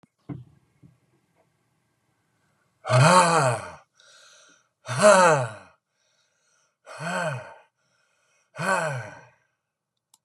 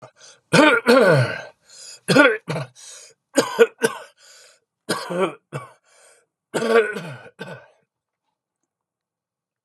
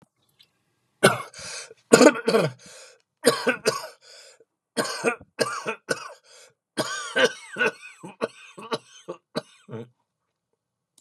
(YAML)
exhalation_length: 10.2 s
exhalation_amplitude: 26092
exhalation_signal_mean_std_ratio: 0.34
cough_length: 9.6 s
cough_amplitude: 30726
cough_signal_mean_std_ratio: 0.39
three_cough_length: 11.0 s
three_cough_amplitude: 32768
three_cough_signal_mean_std_ratio: 0.34
survey_phase: beta (2021-08-13 to 2022-03-07)
age: 65+
gender: Male
wearing_mask: 'No'
symptom_cough_any: true
symptom_new_continuous_cough: true
symptom_runny_or_blocked_nose: true
symptom_sore_throat: true
symptom_fatigue: true
symptom_headache: true
symptom_other: true
smoker_status: Never smoked
respiratory_condition_asthma: true
respiratory_condition_other: false
recruitment_source: Test and Trace
submission_delay: 1 day
covid_test_result: Positive
covid_test_method: LFT